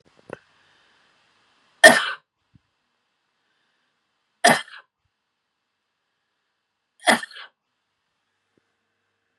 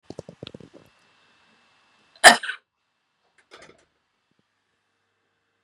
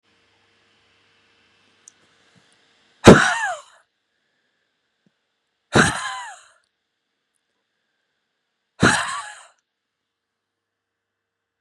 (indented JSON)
{
  "three_cough_length": "9.4 s",
  "three_cough_amplitude": 32768,
  "three_cough_signal_mean_std_ratio": 0.17,
  "cough_length": "5.6 s",
  "cough_amplitude": 32768,
  "cough_signal_mean_std_ratio": 0.13,
  "exhalation_length": "11.6 s",
  "exhalation_amplitude": 32768,
  "exhalation_signal_mean_std_ratio": 0.2,
  "survey_phase": "beta (2021-08-13 to 2022-03-07)",
  "age": "45-64",
  "gender": "Female",
  "wearing_mask": "No",
  "symptom_none": true,
  "smoker_status": "Ex-smoker",
  "respiratory_condition_asthma": false,
  "respiratory_condition_other": false,
  "recruitment_source": "REACT",
  "submission_delay": "1 day",
  "covid_test_result": "Negative",
  "covid_test_method": "RT-qPCR",
  "influenza_a_test_result": "Negative",
  "influenza_b_test_result": "Negative"
}